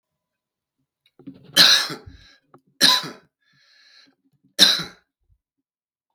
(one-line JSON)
{"three_cough_length": "6.1 s", "three_cough_amplitude": 32768, "three_cough_signal_mean_std_ratio": 0.28, "survey_phase": "beta (2021-08-13 to 2022-03-07)", "age": "45-64", "gender": "Male", "wearing_mask": "No", "symptom_runny_or_blocked_nose": true, "symptom_headache": true, "smoker_status": "Never smoked", "respiratory_condition_asthma": false, "respiratory_condition_other": false, "recruitment_source": "REACT", "submission_delay": "3 days", "covid_test_result": "Negative", "covid_test_method": "RT-qPCR"}